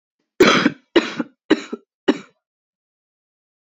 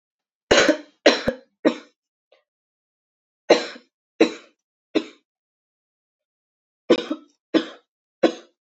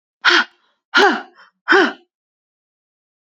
cough_length: 3.7 s
cough_amplitude: 28179
cough_signal_mean_std_ratio: 0.31
three_cough_length: 8.6 s
three_cough_amplitude: 27830
three_cough_signal_mean_std_ratio: 0.27
exhalation_length: 3.2 s
exhalation_amplitude: 31159
exhalation_signal_mean_std_ratio: 0.36
survey_phase: beta (2021-08-13 to 2022-03-07)
age: 18-44
gender: Female
wearing_mask: 'No'
symptom_runny_or_blocked_nose: true
symptom_headache: true
smoker_status: Current smoker (1 to 10 cigarettes per day)
respiratory_condition_asthma: false
respiratory_condition_other: false
recruitment_source: Test and Trace
submission_delay: 1 day
covid_test_result: Positive
covid_test_method: RT-qPCR
covid_ct_value: 32.6
covid_ct_gene: N gene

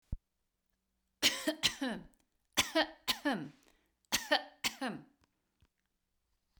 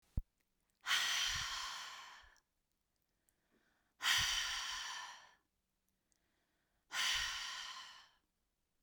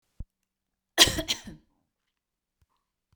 three_cough_length: 6.6 s
three_cough_amplitude: 7373
three_cough_signal_mean_std_ratio: 0.35
exhalation_length: 8.8 s
exhalation_amplitude: 2809
exhalation_signal_mean_std_ratio: 0.47
cough_length: 3.2 s
cough_amplitude: 27097
cough_signal_mean_std_ratio: 0.2
survey_phase: beta (2021-08-13 to 2022-03-07)
age: 45-64
gender: Female
wearing_mask: 'No'
symptom_fatigue: true
symptom_headache: true
smoker_status: Never smoked
respiratory_condition_asthma: false
respiratory_condition_other: false
recruitment_source: REACT
submission_delay: 1 day
covid_test_result: Negative
covid_test_method: RT-qPCR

